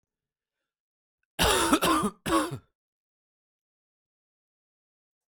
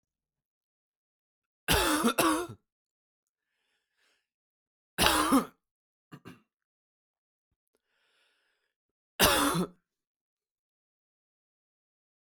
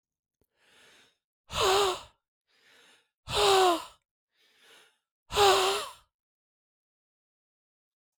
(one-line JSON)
{"cough_length": "5.3 s", "cough_amplitude": 12777, "cough_signal_mean_std_ratio": 0.34, "three_cough_length": "12.3 s", "three_cough_amplitude": 25075, "three_cough_signal_mean_std_ratio": 0.29, "exhalation_length": "8.2 s", "exhalation_amplitude": 11028, "exhalation_signal_mean_std_ratio": 0.34, "survey_phase": "alpha (2021-03-01 to 2021-08-12)", "age": "18-44", "gender": "Male", "wearing_mask": "No", "symptom_cough_any": true, "symptom_new_continuous_cough": true, "symptom_fatigue": true, "symptom_headache": true, "smoker_status": "Prefer not to say", "respiratory_condition_asthma": false, "respiratory_condition_other": false, "recruitment_source": "Test and Trace", "submission_delay": "1 day", "covid_test_result": "Positive", "covid_test_method": "RT-qPCR", "covid_ct_value": 22.7, "covid_ct_gene": "ORF1ab gene", "covid_ct_mean": 23.9, "covid_viral_load": "14000 copies/ml", "covid_viral_load_category": "Low viral load (10K-1M copies/ml)"}